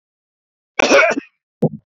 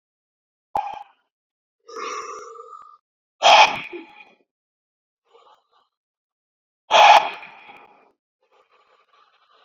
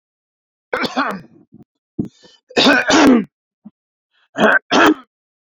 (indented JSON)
{
  "cough_length": "2.0 s",
  "cough_amplitude": 28341,
  "cough_signal_mean_std_ratio": 0.38,
  "exhalation_length": "9.6 s",
  "exhalation_amplitude": 28793,
  "exhalation_signal_mean_std_ratio": 0.25,
  "three_cough_length": "5.5 s",
  "three_cough_amplitude": 31214,
  "three_cough_signal_mean_std_ratio": 0.43,
  "survey_phase": "beta (2021-08-13 to 2022-03-07)",
  "age": "45-64",
  "gender": "Male",
  "wearing_mask": "No",
  "symptom_none": true,
  "smoker_status": "Never smoked",
  "respiratory_condition_asthma": false,
  "respiratory_condition_other": false,
  "recruitment_source": "REACT",
  "submission_delay": "2 days",
  "covid_test_result": "Negative",
  "covid_test_method": "RT-qPCR"
}